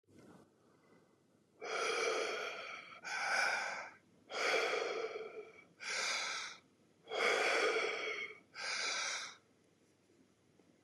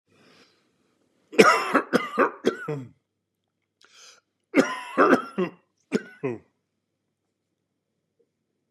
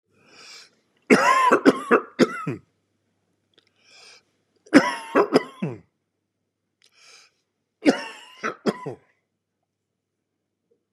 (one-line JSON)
{"exhalation_length": "10.8 s", "exhalation_amplitude": 3041, "exhalation_signal_mean_std_ratio": 0.65, "cough_length": "8.7 s", "cough_amplitude": 32467, "cough_signal_mean_std_ratio": 0.31, "three_cough_length": "10.9 s", "three_cough_amplitude": 31821, "three_cough_signal_mean_std_ratio": 0.31, "survey_phase": "beta (2021-08-13 to 2022-03-07)", "age": "45-64", "gender": "Male", "wearing_mask": "No", "symptom_none": true, "smoker_status": "Ex-smoker", "respiratory_condition_asthma": false, "respiratory_condition_other": false, "recruitment_source": "REACT", "submission_delay": "1 day", "covid_test_result": "Negative", "covid_test_method": "RT-qPCR", "influenza_a_test_result": "Unknown/Void", "influenza_b_test_result": "Unknown/Void"}